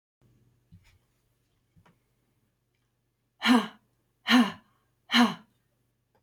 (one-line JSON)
{"exhalation_length": "6.2 s", "exhalation_amplitude": 13151, "exhalation_signal_mean_std_ratio": 0.26, "survey_phase": "beta (2021-08-13 to 2022-03-07)", "age": "45-64", "gender": "Female", "wearing_mask": "No", "symptom_none": true, "smoker_status": "Ex-smoker", "respiratory_condition_asthma": false, "respiratory_condition_other": false, "recruitment_source": "REACT", "submission_delay": "1 day", "covid_test_result": "Negative", "covid_test_method": "RT-qPCR"}